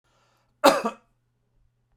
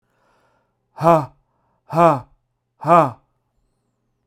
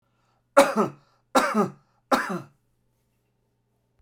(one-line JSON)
{"cough_length": "2.0 s", "cough_amplitude": 31340, "cough_signal_mean_std_ratio": 0.24, "exhalation_length": "4.3 s", "exhalation_amplitude": 32767, "exhalation_signal_mean_std_ratio": 0.31, "three_cough_length": "4.0 s", "three_cough_amplitude": 24757, "three_cough_signal_mean_std_ratio": 0.33, "survey_phase": "beta (2021-08-13 to 2022-03-07)", "age": "18-44", "gender": "Male", "wearing_mask": "No", "symptom_none": true, "symptom_onset": "8 days", "smoker_status": "Never smoked", "respiratory_condition_asthma": false, "respiratory_condition_other": false, "recruitment_source": "REACT", "submission_delay": "1 day", "covid_test_result": "Negative", "covid_test_method": "RT-qPCR"}